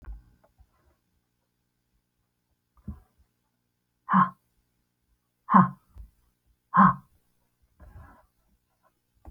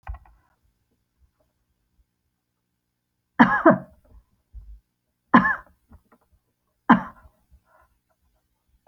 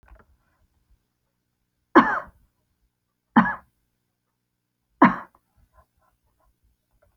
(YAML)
exhalation_length: 9.3 s
exhalation_amplitude: 22569
exhalation_signal_mean_std_ratio: 0.2
cough_length: 8.9 s
cough_amplitude: 27416
cough_signal_mean_std_ratio: 0.21
three_cough_length: 7.2 s
three_cough_amplitude: 28174
three_cough_signal_mean_std_ratio: 0.19
survey_phase: alpha (2021-03-01 to 2021-08-12)
age: 65+
gender: Female
wearing_mask: 'No'
symptom_none: true
smoker_status: Ex-smoker
respiratory_condition_asthma: false
respiratory_condition_other: false
recruitment_source: REACT
submission_delay: 1 day
covid_test_result: Negative
covid_test_method: RT-qPCR